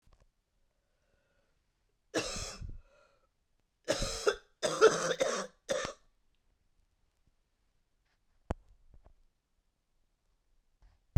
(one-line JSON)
{"cough_length": "11.2 s", "cough_amplitude": 11127, "cough_signal_mean_std_ratio": 0.27, "survey_phase": "beta (2021-08-13 to 2022-03-07)", "age": "65+", "gender": "Female", "wearing_mask": "No", "symptom_cough_any": true, "symptom_fever_high_temperature": true, "symptom_change_to_sense_of_smell_or_taste": true, "symptom_loss_of_taste": true, "smoker_status": "Ex-smoker", "respiratory_condition_asthma": false, "respiratory_condition_other": false, "recruitment_source": "Test and Trace", "submission_delay": "2 days", "covid_test_result": "Positive", "covid_test_method": "RT-qPCR"}